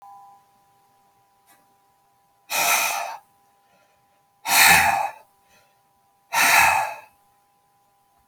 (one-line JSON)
{"exhalation_length": "8.3 s", "exhalation_amplitude": 30486, "exhalation_signal_mean_std_ratio": 0.37, "survey_phase": "alpha (2021-03-01 to 2021-08-12)", "age": "65+", "gender": "Male", "wearing_mask": "No", "symptom_fatigue": true, "symptom_fever_high_temperature": true, "symptom_change_to_sense_of_smell_or_taste": true, "symptom_onset": "3 days", "smoker_status": "Never smoked", "respiratory_condition_asthma": false, "respiratory_condition_other": false, "recruitment_source": "Test and Trace", "submission_delay": "1 day", "covid_test_result": "Positive", "covid_test_method": "RT-qPCR", "covid_ct_value": 16.0, "covid_ct_gene": "N gene", "covid_ct_mean": 17.7, "covid_viral_load": "1600000 copies/ml", "covid_viral_load_category": "High viral load (>1M copies/ml)"}